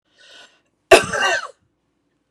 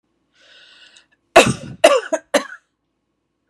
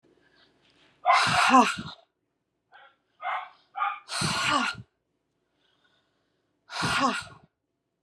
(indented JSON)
{
  "cough_length": "2.3 s",
  "cough_amplitude": 32768,
  "cough_signal_mean_std_ratio": 0.29,
  "three_cough_length": "3.5 s",
  "three_cough_amplitude": 32768,
  "three_cough_signal_mean_std_ratio": 0.28,
  "exhalation_length": "8.0 s",
  "exhalation_amplitude": 17393,
  "exhalation_signal_mean_std_ratio": 0.4,
  "survey_phase": "beta (2021-08-13 to 2022-03-07)",
  "age": "45-64",
  "gender": "Female",
  "wearing_mask": "No",
  "symptom_none": true,
  "smoker_status": "Never smoked",
  "respiratory_condition_asthma": false,
  "respiratory_condition_other": false,
  "recruitment_source": "REACT",
  "submission_delay": "3 days",
  "covid_test_result": "Negative",
  "covid_test_method": "RT-qPCR",
  "influenza_a_test_result": "Negative",
  "influenza_b_test_result": "Negative"
}